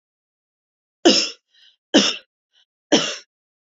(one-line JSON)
{"three_cough_length": "3.7 s", "three_cough_amplitude": 30620, "three_cough_signal_mean_std_ratio": 0.31, "survey_phase": "beta (2021-08-13 to 2022-03-07)", "age": "18-44", "gender": "Female", "wearing_mask": "No", "symptom_none": true, "smoker_status": "Never smoked", "respiratory_condition_asthma": false, "respiratory_condition_other": false, "recruitment_source": "REACT", "submission_delay": "1 day", "covid_test_result": "Negative", "covid_test_method": "RT-qPCR"}